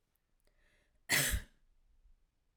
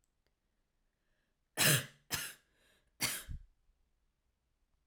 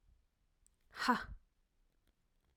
{
  "cough_length": "2.6 s",
  "cough_amplitude": 4203,
  "cough_signal_mean_std_ratio": 0.3,
  "three_cough_length": "4.9 s",
  "three_cough_amplitude": 6171,
  "three_cough_signal_mean_std_ratio": 0.27,
  "exhalation_length": "2.6 s",
  "exhalation_amplitude": 3656,
  "exhalation_signal_mean_std_ratio": 0.26,
  "survey_phase": "alpha (2021-03-01 to 2021-08-12)",
  "age": "18-44",
  "gender": "Female",
  "wearing_mask": "No",
  "symptom_none": true,
  "smoker_status": "Never smoked",
  "respiratory_condition_asthma": false,
  "respiratory_condition_other": false,
  "recruitment_source": "REACT",
  "submission_delay": "13 days",
  "covid_test_result": "Negative",
  "covid_test_method": "RT-qPCR"
}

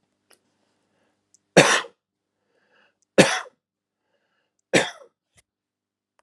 {
  "three_cough_length": "6.2 s",
  "three_cough_amplitude": 32767,
  "three_cough_signal_mean_std_ratio": 0.21,
  "survey_phase": "alpha (2021-03-01 to 2021-08-12)",
  "age": "45-64",
  "gender": "Male",
  "wearing_mask": "No",
  "symptom_none": true,
  "smoker_status": "Never smoked",
  "respiratory_condition_asthma": false,
  "respiratory_condition_other": false,
  "recruitment_source": "REACT",
  "submission_delay": "1 day",
  "covid_test_result": "Negative",
  "covid_test_method": "RT-qPCR"
}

